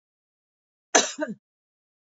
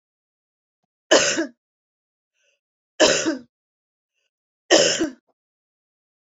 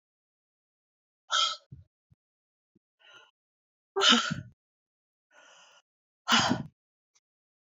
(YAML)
cough_length: 2.1 s
cough_amplitude: 25146
cough_signal_mean_std_ratio: 0.23
three_cough_length: 6.2 s
three_cough_amplitude: 26811
three_cough_signal_mean_std_ratio: 0.31
exhalation_length: 7.7 s
exhalation_amplitude: 13605
exhalation_signal_mean_std_ratio: 0.27
survey_phase: beta (2021-08-13 to 2022-03-07)
age: 45-64
gender: Female
wearing_mask: 'No'
symptom_runny_or_blocked_nose: true
symptom_onset: 12 days
smoker_status: Never smoked
respiratory_condition_asthma: true
respiratory_condition_other: false
recruitment_source: REACT
submission_delay: 2 days
covid_test_result: Negative
covid_test_method: RT-qPCR